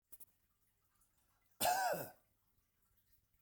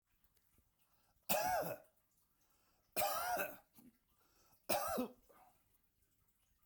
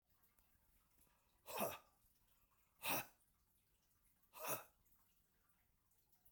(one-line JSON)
{"cough_length": "3.4 s", "cough_amplitude": 2339, "cough_signal_mean_std_ratio": 0.32, "three_cough_length": "6.7 s", "three_cough_amplitude": 2885, "three_cough_signal_mean_std_ratio": 0.4, "exhalation_length": "6.3 s", "exhalation_amplitude": 1347, "exhalation_signal_mean_std_ratio": 0.3, "survey_phase": "beta (2021-08-13 to 2022-03-07)", "age": "45-64", "gender": "Male", "wearing_mask": "No", "symptom_none": true, "symptom_onset": "12 days", "smoker_status": "Never smoked", "respiratory_condition_asthma": false, "respiratory_condition_other": false, "recruitment_source": "REACT", "submission_delay": "1 day", "covid_test_result": "Negative", "covid_test_method": "RT-qPCR", "influenza_a_test_result": "Negative", "influenza_b_test_result": "Negative"}